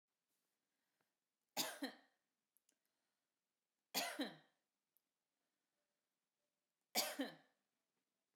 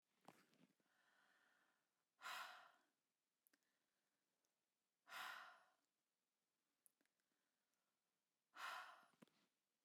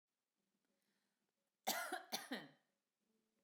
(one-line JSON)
{"three_cough_length": "8.4 s", "three_cough_amplitude": 1695, "three_cough_signal_mean_std_ratio": 0.26, "exhalation_length": "9.8 s", "exhalation_amplitude": 247, "exhalation_signal_mean_std_ratio": 0.32, "cough_length": "3.4 s", "cough_amplitude": 1475, "cough_signal_mean_std_ratio": 0.32, "survey_phase": "beta (2021-08-13 to 2022-03-07)", "age": "45-64", "gender": "Female", "wearing_mask": "No", "symptom_none": true, "smoker_status": "Ex-smoker", "respiratory_condition_asthma": false, "respiratory_condition_other": false, "recruitment_source": "REACT", "submission_delay": "1 day", "covid_test_result": "Negative", "covid_test_method": "RT-qPCR", "influenza_a_test_result": "Negative", "influenza_b_test_result": "Negative"}